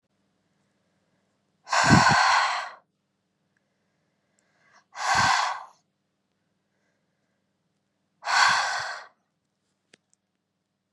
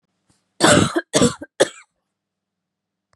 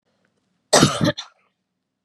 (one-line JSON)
{"exhalation_length": "10.9 s", "exhalation_amplitude": 22537, "exhalation_signal_mean_std_ratio": 0.35, "three_cough_length": "3.2 s", "three_cough_amplitude": 30999, "three_cough_signal_mean_std_ratio": 0.34, "cough_length": "2.0 s", "cough_amplitude": 30705, "cough_signal_mean_std_ratio": 0.32, "survey_phase": "beta (2021-08-13 to 2022-03-07)", "age": "18-44", "gender": "Female", "wearing_mask": "No", "symptom_none": true, "smoker_status": "Never smoked", "respiratory_condition_asthma": false, "respiratory_condition_other": false, "recruitment_source": "REACT", "submission_delay": "1 day", "covid_test_result": "Negative", "covid_test_method": "RT-qPCR"}